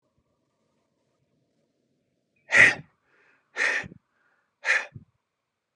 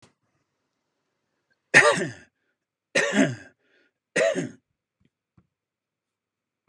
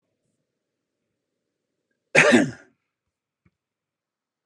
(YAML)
exhalation_length: 5.8 s
exhalation_amplitude: 23115
exhalation_signal_mean_std_ratio: 0.24
three_cough_length: 6.7 s
three_cough_amplitude: 30364
three_cough_signal_mean_std_ratio: 0.28
cough_length: 4.5 s
cough_amplitude: 30400
cough_signal_mean_std_ratio: 0.22
survey_phase: beta (2021-08-13 to 2022-03-07)
age: 65+
gender: Male
wearing_mask: 'No'
symptom_none: true
smoker_status: Never smoked
respiratory_condition_asthma: false
respiratory_condition_other: false
recruitment_source: REACT
submission_delay: 2 days
covid_test_result: Negative
covid_test_method: RT-qPCR
influenza_a_test_result: Negative
influenza_b_test_result: Negative